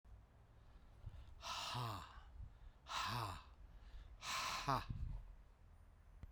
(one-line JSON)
{"exhalation_length": "6.3 s", "exhalation_amplitude": 1761, "exhalation_signal_mean_std_ratio": 0.67, "survey_phase": "beta (2021-08-13 to 2022-03-07)", "age": "45-64", "gender": "Male", "wearing_mask": "No", "symptom_headache": true, "symptom_change_to_sense_of_smell_or_taste": true, "symptom_onset": "5 days", "smoker_status": "Prefer not to say", "respiratory_condition_asthma": false, "respiratory_condition_other": true, "recruitment_source": "Test and Trace", "submission_delay": "2 days", "covid_test_result": "Positive", "covid_test_method": "RT-qPCR"}